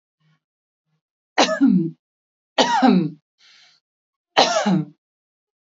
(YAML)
three_cough_length: 5.6 s
three_cough_amplitude: 29538
three_cough_signal_mean_std_ratio: 0.41
survey_phase: beta (2021-08-13 to 2022-03-07)
age: 18-44
gender: Female
wearing_mask: 'No'
symptom_none: true
smoker_status: Never smoked
respiratory_condition_asthma: true
respiratory_condition_other: false
recruitment_source: REACT
submission_delay: 1 day
covid_test_result: Negative
covid_test_method: RT-qPCR
influenza_a_test_result: Negative
influenza_b_test_result: Negative